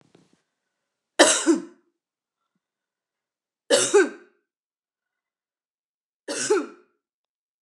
three_cough_length: 7.6 s
three_cough_amplitude: 28532
three_cough_signal_mean_std_ratio: 0.28
survey_phase: beta (2021-08-13 to 2022-03-07)
age: 45-64
gender: Female
wearing_mask: 'No'
symptom_none: true
smoker_status: Never smoked
respiratory_condition_asthma: false
respiratory_condition_other: false
recruitment_source: REACT
submission_delay: 2 days
covid_test_result: Negative
covid_test_method: RT-qPCR
influenza_a_test_result: Negative
influenza_b_test_result: Negative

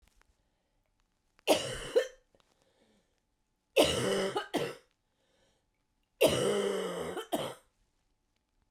three_cough_length: 8.7 s
three_cough_amplitude: 9111
three_cough_signal_mean_std_ratio: 0.4
survey_phase: beta (2021-08-13 to 2022-03-07)
age: 45-64
gender: Female
wearing_mask: 'No'
symptom_cough_any: true
symptom_new_continuous_cough: true
symptom_runny_or_blocked_nose: true
symptom_sore_throat: true
symptom_diarrhoea: true
symptom_fatigue: true
symptom_headache: true
symptom_change_to_sense_of_smell_or_taste: true
symptom_loss_of_taste: true
symptom_onset: 7 days
smoker_status: Current smoker (e-cigarettes or vapes only)
respiratory_condition_asthma: false
respiratory_condition_other: false
recruitment_source: Test and Trace
submission_delay: 2 days
covid_test_result: Positive
covid_test_method: RT-qPCR
covid_ct_value: 20.4
covid_ct_gene: ORF1ab gene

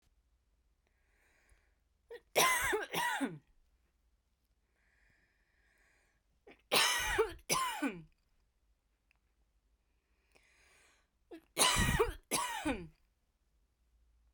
three_cough_length: 14.3 s
three_cough_amplitude: 6404
three_cough_signal_mean_std_ratio: 0.37
survey_phase: beta (2021-08-13 to 2022-03-07)
age: 45-64
gender: Female
wearing_mask: 'No'
symptom_none: true
smoker_status: Never smoked
respiratory_condition_asthma: false
respiratory_condition_other: false
recruitment_source: REACT
submission_delay: 1 day
covid_test_result: Negative
covid_test_method: RT-qPCR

